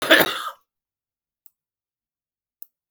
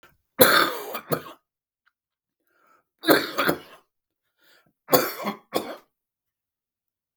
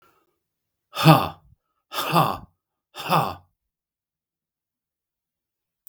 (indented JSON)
{
  "cough_length": "2.9 s",
  "cough_amplitude": 32766,
  "cough_signal_mean_std_ratio": 0.24,
  "three_cough_length": "7.2 s",
  "three_cough_amplitude": 32768,
  "three_cough_signal_mean_std_ratio": 0.31,
  "exhalation_length": "5.9 s",
  "exhalation_amplitude": 32768,
  "exhalation_signal_mean_std_ratio": 0.27,
  "survey_phase": "beta (2021-08-13 to 2022-03-07)",
  "age": "45-64",
  "gender": "Male",
  "wearing_mask": "No",
  "symptom_runny_or_blocked_nose": true,
  "smoker_status": "Never smoked",
  "respiratory_condition_asthma": false,
  "respiratory_condition_other": false,
  "recruitment_source": "Test and Trace",
  "submission_delay": "-1 day",
  "covid_test_result": "Positive",
  "covid_test_method": "LFT"
}